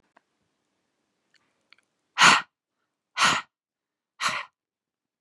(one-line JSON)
{"exhalation_length": "5.2 s", "exhalation_amplitude": 25377, "exhalation_signal_mean_std_ratio": 0.25, "survey_phase": "beta (2021-08-13 to 2022-03-07)", "age": "18-44", "gender": "Female", "wearing_mask": "No", "symptom_cough_any": true, "symptom_runny_or_blocked_nose": true, "symptom_sore_throat": true, "symptom_fatigue": true, "symptom_onset": "12 days", "smoker_status": "Ex-smoker", "respiratory_condition_asthma": true, "respiratory_condition_other": false, "recruitment_source": "REACT", "submission_delay": "0 days", "covid_test_result": "Negative", "covid_test_method": "RT-qPCR", "influenza_a_test_result": "Negative", "influenza_b_test_result": "Negative"}